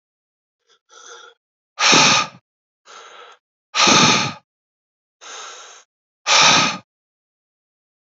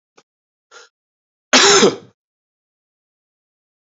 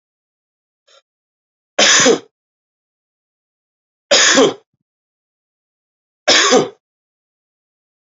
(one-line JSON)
{"exhalation_length": "8.1 s", "exhalation_amplitude": 32768, "exhalation_signal_mean_std_ratio": 0.36, "cough_length": "3.8 s", "cough_amplitude": 32568, "cough_signal_mean_std_ratio": 0.27, "three_cough_length": "8.2 s", "three_cough_amplitude": 30852, "three_cough_signal_mean_std_ratio": 0.32, "survey_phase": "alpha (2021-03-01 to 2021-08-12)", "age": "45-64", "gender": "Male", "wearing_mask": "No", "symptom_cough_any": true, "symptom_shortness_of_breath": true, "symptom_change_to_sense_of_smell_or_taste": true, "symptom_loss_of_taste": true, "symptom_onset": "4 days", "smoker_status": "Never smoked", "respiratory_condition_asthma": false, "respiratory_condition_other": false, "recruitment_source": "Test and Trace", "submission_delay": "2 days", "covid_test_result": "Positive", "covid_test_method": "RT-qPCR", "covid_ct_value": 15.5, "covid_ct_gene": "ORF1ab gene", "covid_ct_mean": 16.0, "covid_viral_load": "5700000 copies/ml", "covid_viral_load_category": "High viral load (>1M copies/ml)"}